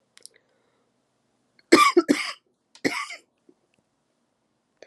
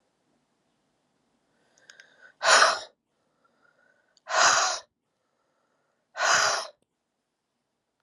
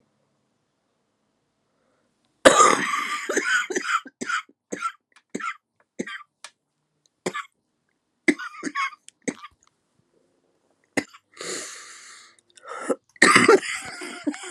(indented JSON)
{
  "three_cough_length": "4.9 s",
  "three_cough_amplitude": 32146,
  "three_cough_signal_mean_std_ratio": 0.24,
  "exhalation_length": "8.0 s",
  "exhalation_amplitude": 21165,
  "exhalation_signal_mean_std_ratio": 0.31,
  "cough_length": "14.5 s",
  "cough_amplitude": 32768,
  "cough_signal_mean_std_ratio": 0.33,
  "survey_phase": "alpha (2021-03-01 to 2021-08-12)",
  "age": "45-64",
  "gender": "Female",
  "wearing_mask": "No",
  "symptom_cough_any": true,
  "symptom_abdominal_pain": true,
  "symptom_fatigue": true,
  "symptom_fever_high_temperature": true,
  "symptom_headache": true,
  "symptom_change_to_sense_of_smell_or_taste": true,
  "symptom_onset": "4 days",
  "smoker_status": "Ex-smoker",
  "recruitment_source": "Test and Trace",
  "submission_delay": "1 day",
  "covid_test_result": "Positive",
  "covid_test_method": "RT-qPCR",
  "covid_ct_value": 16.5,
  "covid_ct_gene": "ORF1ab gene",
  "covid_ct_mean": 17.7,
  "covid_viral_load": "1600000 copies/ml",
  "covid_viral_load_category": "High viral load (>1M copies/ml)"
}